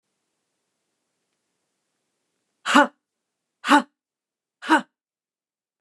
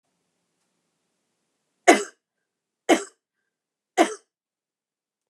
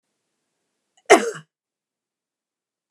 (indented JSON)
{
  "exhalation_length": "5.8 s",
  "exhalation_amplitude": 27077,
  "exhalation_signal_mean_std_ratio": 0.21,
  "three_cough_length": "5.3 s",
  "three_cough_amplitude": 29203,
  "three_cough_signal_mean_std_ratio": 0.19,
  "cough_length": "2.9 s",
  "cough_amplitude": 29204,
  "cough_signal_mean_std_ratio": 0.17,
  "survey_phase": "beta (2021-08-13 to 2022-03-07)",
  "age": "45-64",
  "gender": "Female",
  "wearing_mask": "No",
  "symptom_none": true,
  "smoker_status": "Never smoked",
  "respiratory_condition_asthma": false,
  "respiratory_condition_other": false,
  "recruitment_source": "Test and Trace",
  "submission_delay": "0 days",
  "covid_test_result": "Negative",
  "covid_test_method": "LFT"
}